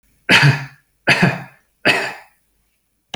{"three_cough_length": "3.2 s", "three_cough_amplitude": 31347, "three_cough_signal_mean_std_ratio": 0.42, "survey_phase": "beta (2021-08-13 to 2022-03-07)", "age": "45-64", "gender": "Male", "wearing_mask": "No", "symptom_none": true, "smoker_status": "Never smoked", "respiratory_condition_asthma": false, "respiratory_condition_other": false, "recruitment_source": "REACT", "submission_delay": "0 days", "covid_test_result": "Negative", "covid_test_method": "RT-qPCR"}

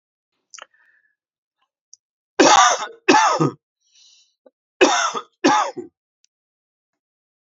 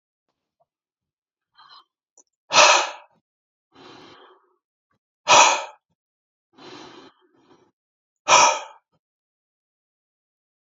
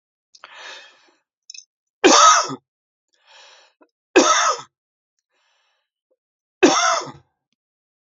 {"cough_length": "7.5 s", "cough_amplitude": 29623, "cough_signal_mean_std_ratio": 0.35, "exhalation_length": "10.8 s", "exhalation_amplitude": 30443, "exhalation_signal_mean_std_ratio": 0.24, "three_cough_length": "8.1 s", "three_cough_amplitude": 29927, "three_cough_signal_mean_std_ratio": 0.31, "survey_phase": "beta (2021-08-13 to 2022-03-07)", "age": "45-64", "gender": "Male", "wearing_mask": "No", "symptom_runny_or_blocked_nose": true, "symptom_sore_throat": true, "symptom_fatigue": true, "symptom_headache": true, "symptom_other": true, "smoker_status": "Never smoked", "respiratory_condition_asthma": false, "respiratory_condition_other": false, "recruitment_source": "Test and Trace", "submission_delay": "2 days", "covid_test_result": "Positive", "covid_test_method": "RT-qPCR", "covid_ct_value": 20.8, "covid_ct_gene": "ORF1ab gene", "covid_ct_mean": 21.9, "covid_viral_load": "66000 copies/ml", "covid_viral_load_category": "Low viral load (10K-1M copies/ml)"}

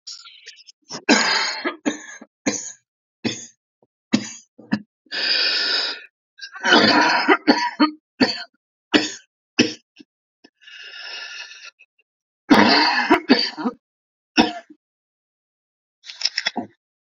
{"cough_length": "17.1 s", "cough_amplitude": 30750, "cough_signal_mean_std_ratio": 0.42, "survey_phase": "alpha (2021-03-01 to 2021-08-12)", "age": "45-64", "gender": "Male", "wearing_mask": "No", "symptom_cough_any": true, "symptom_fever_high_temperature": true, "symptom_headache": true, "symptom_change_to_sense_of_smell_or_taste": true, "symptom_loss_of_taste": true, "symptom_onset": "4 days", "smoker_status": "Ex-smoker", "respiratory_condition_asthma": false, "respiratory_condition_other": false, "recruitment_source": "Test and Trace", "submission_delay": "2 days", "covid_test_result": "Positive", "covid_test_method": "RT-qPCR"}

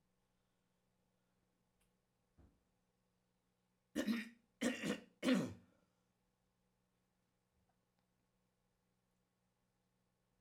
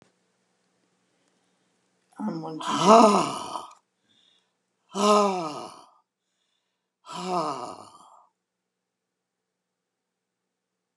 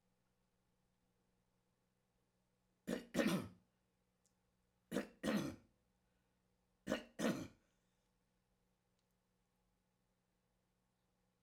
{"cough_length": "10.4 s", "cough_amplitude": 2478, "cough_signal_mean_std_ratio": 0.24, "exhalation_length": "11.0 s", "exhalation_amplitude": 24509, "exhalation_signal_mean_std_ratio": 0.3, "three_cough_length": "11.4 s", "three_cough_amplitude": 2231, "three_cough_signal_mean_std_ratio": 0.27, "survey_phase": "alpha (2021-03-01 to 2021-08-12)", "age": "65+", "gender": "Male", "wearing_mask": "No", "symptom_none": true, "smoker_status": "Never smoked", "respiratory_condition_asthma": false, "respiratory_condition_other": false, "recruitment_source": "REACT", "submission_delay": "3 days", "covid_test_result": "Negative", "covid_test_method": "RT-qPCR"}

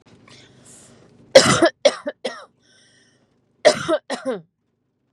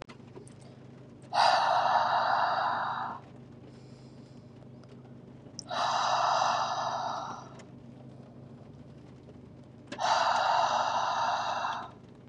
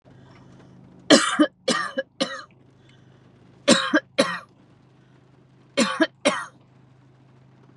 {"cough_length": "5.1 s", "cough_amplitude": 32768, "cough_signal_mean_std_ratio": 0.3, "exhalation_length": "12.3 s", "exhalation_amplitude": 8927, "exhalation_signal_mean_std_ratio": 0.66, "three_cough_length": "7.8 s", "three_cough_amplitude": 29911, "three_cough_signal_mean_std_ratio": 0.34, "survey_phase": "beta (2021-08-13 to 2022-03-07)", "age": "18-44", "gender": "Female", "wearing_mask": "No", "symptom_none": true, "smoker_status": "Never smoked", "respiratory_condition_asthma": false, "respiratory_condition_other": false, "recruitment_source": "REACT", "submission_delay": "2 days", "covid_test_result": "Negative", "covid_test_method": "RT-qPCR", "influenza_a_test_result": "Negative", "influenza_b_test_result": "Negative"}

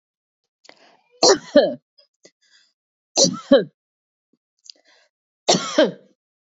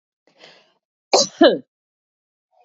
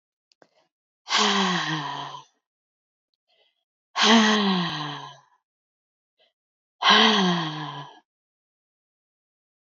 {"three_cough_length": "6.6 s", "three_cough_amplitude": 30311, "three_cough_signal_mean_std_ratio": 0.29, "cough_length": "2.6 s", "cough_amplitude": 32767, "cough_signal_mean_std_ratio": 0.26, "exhalation_length": "9.6 s", "exhalation_amplitude": 22371, "exhalation_signal_mean_std_ratio": 0.42, "survey_phase": "beta (2021-08-13 to 2022-03-07)", "age": "45-64", "gender": "Female", "wearing_mask": "No", "symptom_none": true, "smoker_status": "Ex-smoker", "respiratory_condition_asthma": false, "respiratory_condition_other": false, "recruitment_source": "REACT", "submission_delay": "4 days", "covid_test_result": "Negative", "covid_test_method": "RT-qPCR", "influenza_a_test_result": "Negative", "influenza_b_test_result": "Negative"}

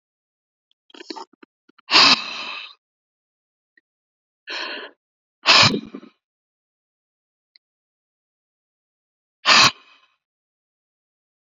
{"exhalation_length": "11.4 s", "exhalation_amplitude": 32767, "exhalation_signal_mean_std_ratio": 0.24, "survey_phase": "beta (2021-08-13 to 2022-03-07)", "age": "45-64", "gender": "Male", "wearing_mask": "No", "symptom_none": true, "smoker_status": "Ex-smoker", "respiratory_condition_asthma": false, "respiratory_condition_other": false, "recruitment_source": "REACT", "submission_delay": "11 days", "covid_test_result": "Negative", "covid_test_method": "RT-qPCR", "influenza_a_test_result": "Negative", "influenza_b_test_result": "Negative"}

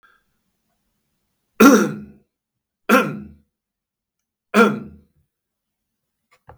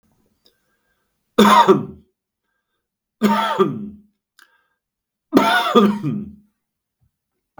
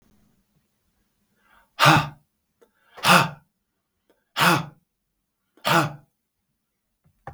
{"cough_length": "6.6 s", "cough_amplitude": 32768, "cough_signal_mean_std_ratio": 0.26, "three_cough_length": "7.6 s", "three_cough_amplitude": 32766, "three_cough_signal_mean_std_ratio": 0.37, "exhalation_length": "7.3 s", "exhalation_amplitude": 32766, "exhalation_signal_mean_std_ratio": 0.29, "survey_phase": "beta (2021-08-13 to 2022-03-07)", "age": "45-64", "gender": "Male", "wearing_mask": "No", "symptom_sore_throat": true, "symptom_onset": "2 days", "smoker_status": "Never smoked", "respiratory_condition_asthma": false, "respiratory_condition_other": false, "recruitment_source": "Test and Trace", "submission_delay": "1 day", "covid_test_result": "Positive", "covid_test_method": "ePCR"}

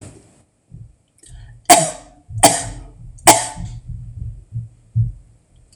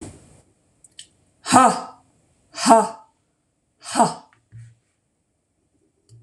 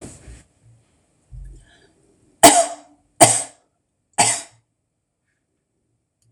{"cough_length": "5.8 s", "cough_amplitude": 26028, "cough_signal_mean_std_ratio": 0.35, "exhalation_length": "6.2 s", "exhalation_amplitude": 26027, "exhalation_signal_mean_std_ratio": 0.28, "three_cough_length": "6.3 s", "three_cough_amplitude": 26028, "three_cough_signal_mean_std_ratio": 0.24, "survey_phase": "beta (2021-08-13 to 2022-03-07)", "age": "45-64", "gender": "Female", "wearing_mask": "No", "symptom_none": true, "smoker_status": "Never smoked", "respiratory_condition_asthma": true, "respiratory_condition_other": false, "recruitment_source": "REACT", "submission_delay": "1 day", "covid_test_result": "Negative", "covid_test_method": "RT-qPCR", "influenza_a_test_result": "Negative", "influenza_b_test_result": "Negative"}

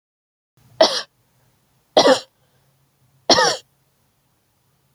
{"cough_length": "4.9 s", "cough_amplitude": 30477, "cough_signal_mean_std_ratio": 0.28, "survey_phase": "alpha (2021-03-01 to 2021-08-12)", "age": "45-64", "gender": "Female", "wearing_mask": "No", "symptom_none": true, "smoker_status": "Never smoked", "respiratory_condition_asthma": false, "respiratory_condition_other": false, "recruitment_source": "REACT", "submission_delay": "2 days", "covid_test_result": "Negative", "covid_test_method": "RT-qPCR"}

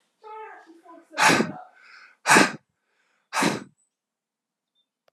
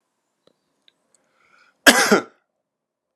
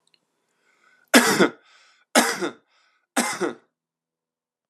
{"exhalation_length": "5.1 s", "exhalation_amplitude": 26250, "exhalation_signal_mean_std_ratio": 0.32, "cough_length": "3.2 s", "cough_amplitude": 32768, "cough_signal_mean_std_ratio": 0.23, "three_cough_length": "4.7 s", "three_cough_amplitude": 32477, "three_cough_signal_mean_std_ratio": 0.32, "survey_phase": "beta (2021-08-13 to 2022-03-07)", "age": "18-44", "gender": "Male", "wearing_mask": "No", "symptom_cough_any": true, "symptom_runny_or_blocked_nose": true, "symptom_shortness_of_breath": true, "symptom_fatigue": true, "symptom_fever_high_temperature": true, "symptom_headache": true, "symptom_change_to_sense_of_smell_or_taste": true, "symptom_loss_of_taste": true, "symptom_onset": "4 days", "smoker_status": "Never smoked", "respiratory_condition_asthma": true, "respiratory_condition_other": false, "recruitment_source": "Test and Trace", "submission_delay": "1 day", "covid_test_result": "Positive", "covid_test_method": "RT-qPCR"}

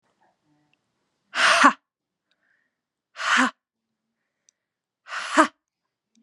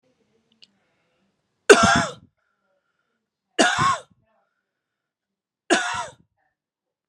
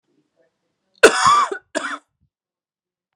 {"exhalation_length": "6.2 s", "exhalation_amplitude": 29135, "exhalation_signal_mean_std_ratio": 0.28, "three_cough_length": "7.1 s", "three_cough_amplitude": 32768, "three_cough_signal_mean_std_ratio": 0.27, "cough_length": "3.2 s", "cough_amplitude": 32768, "cough_signal_mean_std_ratio": 0.32, "survey_phase": "beta (2021-08-13 to 2022-03-07)", "age": "18-44", "gender": "Female", "wearing_mask": "No", "symptom_runny_or_blocked_nose": true, "smoker_status": "Never smoked", "respiratory_condition_asthma": false, "respiratory_condition_other": false, "recruitment_source": "REACT", "submission_delay": "0 days", "covid_test_result": "Negative", "covid_test_method": "RT-qPCR", "influenza_a_test_result": "Negative", "influenza_b_test_result": "Negative"}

